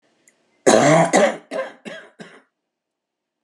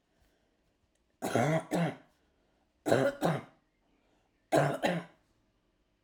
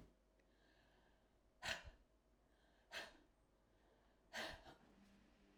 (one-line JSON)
{"cough_length": "3.4 s", "cough_amplitude": 32675, "cough_signal_mean_std_ratio": 0.39, "three_cough_length": "6.0 s", "three_cough_amplitude": 10216, "three_cough_signal_mean_std_ratio": 0.4, "exhalation_length": "5.6 s", "exhalation_amplitude": 909, "exhalation_signal_mean_std_ratio": 0.39, "survey_phase": "alpha (2021-03-01 to 2021-08-12)", "age": "65+", "gender": "Female", "wearing_mask": "No", "symptom_cough_any": true, "symptom_headache": true, "smoker_status": "Never smoked", "respiratory_condition_asthma": true, "respiratory_condition_other": false, "recruitment_source": "REACT", "submission_delay": "2 days", "covid_test_result": "Negative", "covid_test_method": "RT-qPCR"}